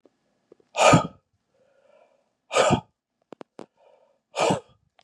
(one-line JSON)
{"exhalation_length": "5.0 s", "exhalation_amplitude": 24364, "exhalation_signal_mean_std_ratio": 0.3, "survey_phase": "beta (2021-08-13 to 2022-03-07)", "age": "45-64", "gender": "Male", "wearing_mask": "No", "symptom_cough_any": true, "symptom_runny_or_blocked_nose": true, "symptom_headache": true, "symptom_onset": "3 days", "smoker_status": "Ex-smoker", "respiratory_condition_asthma": false, "respiratory_condition_other": false, "recruitment_source": "Test and Trace", "submission_delay": "2 days", "covid_test_result": "Positive", "covid_test_method": "RT-qPCR", "covid_ct_value": 18.7, "covid_ct_gene": "ORF1ab gene", "covid_ct_mean": 19.3, "covid_viral_load": "480000 copies/ml", "covid_viral_load_category": "Low viral load (10K-1M copies/ml)"}